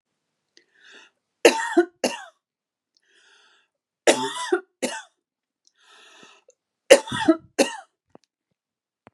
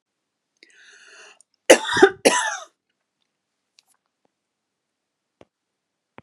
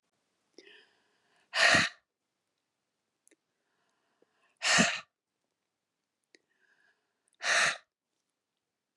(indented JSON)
{
  "three_cough_length": "9.1 s",
  "three_cough_amplitude": 32768,
  "three_cough_signal_mean_std_ratio": 0.25,
  "cough_length": "6.2 s",
  "cough_amplitude": 32768,
  "cough_signal_mean_std_ratio": 0.21,
  "exhalation_length": "9.0 s",
  "exhalation_amplitude": 9440,
  "exhalation_signal_mean_std_ratio": 0.26,
  "survey_phase": "beta (2021-08-13 to 2022-03-07)",
  "age": "45-64",
  "gender": "Female",
  "wearing_mask": "No",
  "symptom_cough_any": true,
  "symptom_sore_throat": true,
  "smoker_status": "Never smoked",
  "respiratory_condition_asthma": false,
  "respiratory_condition_other": false,
  "recruitment_source": "Test and Trace",
  "submission_delay": "2 days",
  "covid_test_result": "Positive",
  "covid_test_method": "RT-qPCR",
  "covid_ct_value": 26.5,
  "covid_ct_gene": "ORF1ab gene"
}